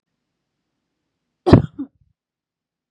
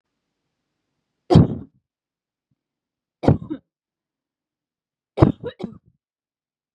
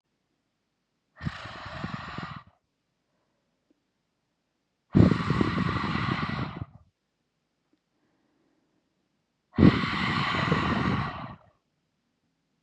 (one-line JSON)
{"cough_length": "2.9 s", "cough_amplitude": 32768, "cough_signal_mean_std_ratio": 0.18, "three_cough_length": "6.7 s", "three_cough_amplitude": 32768, "three_cough_signal_mean_std_ratio": 0.2, "exhalation_length": "12.6 s", "exhalation_amplitude": 19416, "exhalation_signal_mean_std_ratio": 0.38, "survey_phase": "beta (2021-08-13 to 2022-03-07)", "age": "18-44", "gender": "Female", "wearing_mask": "No", "symptom_none": true, "smoker_status": "Never smoked", "respiratory_condition_asthma": false, "respiratory_condition_other": false, "recruitment_source": "REACT", "submission_delay": "1 day", "covid_test_result": "Negative", "covid_test_method": "RT-qPCR", "influenza_a_test_result": "Unknown/Void", "influenza_b_test_result": "Unknown/Void"}